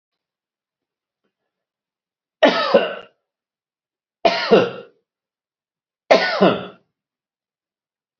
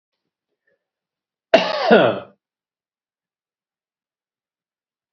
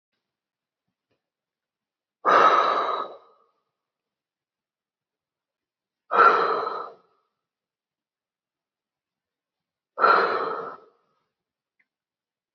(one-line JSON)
{"three_cough_length": "8.2 s", "three_cough_amplitude": 28501, "three_cough_signal_mean_std_ratio": 0.3, "cough_length": "5.1 s", "cough_amplitude": 32401, "cough_signal_mean_std_ratio": 0.24, "exhalation_length": "12.5 s", "exhalation_amplitude": 20394, "exhalation_signal_mean_std_ratio": 0.3, "survey_phase": "beta (2021-08-13 to 2022-03-07)", "age": "65+", "gender": "Male", "wearing_mask": "No", "symptom_none": true, "smoker_status": "Ex-smoker", "respiratory_condition_asthma": false, "respiratory_condition_other": false, "recruitment_source": "REACT", "submission_delay": "2 days", "covid_test_result": "Negative", "covid_test_method": "RT-qPCR", "influenza_a_test_result": "Negative", "influenza_b_test_result": "Negative"}